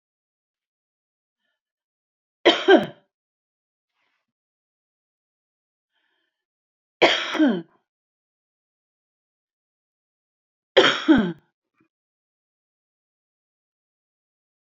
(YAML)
three_cough_length: 14.8 s
three_cough_amplitude: 27764
three_cough_signal_mean_std_ratio: 0.21
survey_phase: beta (2021-08-13 to 2022-03-07)
age: 65+
gender: Female
wearing_mask: 'No'
symptom_none: true
smoker_status: Ex-smoker
respiratory_condition_asthma: false
respiratory_condition_other: true
recruitment_source: REACT
submission_delay: 24 days
covid_test_result: Negative
covid_test_method: RT-qPCR